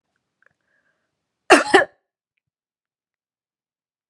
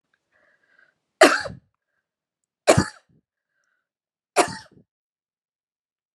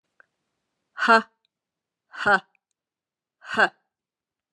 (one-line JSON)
{"cough_length": "4.1 s", "cough_amplitude": 32768, "cough_signal_mean_std_ratio": 0.19, "three_cough_length": "6.1 s", "three_cough_amplitude": 32677, "three_cough_signal_mean_std_ratio": 0.2, "exhalation_length": "4.5 s", "exhalation_amplitude": 20504, "exhalation_signal_mean_std_ratio": 0.25, "survey_phase": "beta (2021-08-13 to 2022-03-07)", "age": "45-64", "gender": "Female", "wearing_mask": "No", "symptom_none": true, "symptom_onset": "12 days", "smoker_status": "Never smoked", "respiratory_condition_asthma": false, "respiratory_condition_other": false, "recruitment_source": "REACT", "submission_delay": "1 day", "covid_test_result": "Negative", "covid_test_method": "RT-qPCR"}